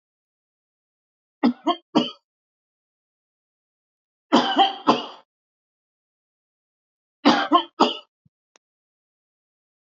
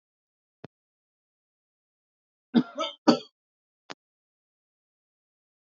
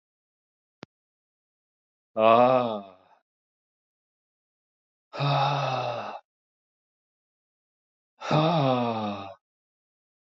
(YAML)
three_cough_length: 9.9 s
three_cough_amplitude: 25701
three_cough_signal_mean_std_ratio: 0.27
cough_length: 5.7 s
cough_amplitude: 17396
cough_signal_mean_std_ratio: 0.16
exhalation_length: 10.2 s
exhalation_amplitude: 17101
exhalation_signal_mean_std_ratio: 0.37
survey_phase: alpha (2021-03-01 to 2021-08-12)
age: 45-64
gender: Male
wearing_mask: 'No'
symptom_none: true
smoker_status: Never smoked
respiratory_condition_asthma: false
respiratory_condition_other: false
recruitment_source: REACT
submission_delay: 3 days
covid_test_result: Negative
covid_test_method: RT-qPCR